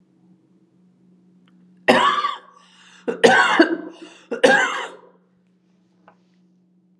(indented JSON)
{
  "three_cough_length": "7.0 s",
  "three_cough_amplitude": 32629,
  "three_cough_signal_mean_std_ratio": 0.37,
  "survey_phase": "alpha (2021-03-01 to 2021-08-12)",
  "age": "45-64",
  "gender": "Female",
  "wearing_mask": "No",
  "symptom_none": true,
  "smoker_status": "Never smoked",
  "respiratory_condition_asthma": false,
  "respiratory_condition_other": false,
  "recruitment_source": "Test and Trace",
  "submission_delay": "0 days",
  "covid_test_result": "Negative",
  "covid_test_method": "LFT"
}